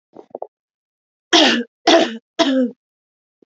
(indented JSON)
{
  "three_cough_length": "3.5 s",
  "three_cough_amplitude": 32767,
  "three_cough_signal_mean_std_ratio": 0.4,
  "survey_phase": "alpha (2021-03-01 to 2021-08-12)",
  "age": "18-44",
  "gender": "Female",
  "wearing_mask": "No",
  "symptom_none": true,
  "smoker_status": "Never smoked",
  "respiratory_condition_asthma": true,
  "respiratory_condition_other": false,
  "recruitment_source": "REACT",
  "submission_delay": "1 day",
  "covid_test_result": "Negative",
  "covid_test_method": "RT-qPCR"
}